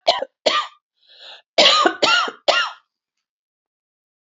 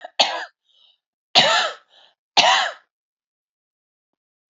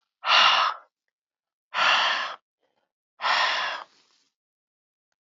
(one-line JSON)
{"cough_length": "4.3 s", "cough_amplitude": 28912, "cough_signal_mean_std_ratio": 0.42, "three_cough_length": "4.5 s", "three_cough_amplitude": 31384, "three_cough_signal_mean_std_ratio": 0.34, "exhalation_length": "5.2 s", "exhalation_amplitude": 16922, "exhalation_signal_mean_std_ratio": 0.45, "survey_phase": "alpha (2021-03-01 to 2021-08-12)", "age": "45-64", "gender": "Female", "wearing_mask": "No", "symptom_fatigue": true, "symptom_fever_high_temperature": true, "smoker_status": "Never smoked", "respiratory_condition_asthma": false, "respiratory_condition_other": false, "recruitment_source": "Test and Trace", "submission_delay": "2 days", "covid_test_result": "Positive", "covid_test_method": "RT-qPCR"}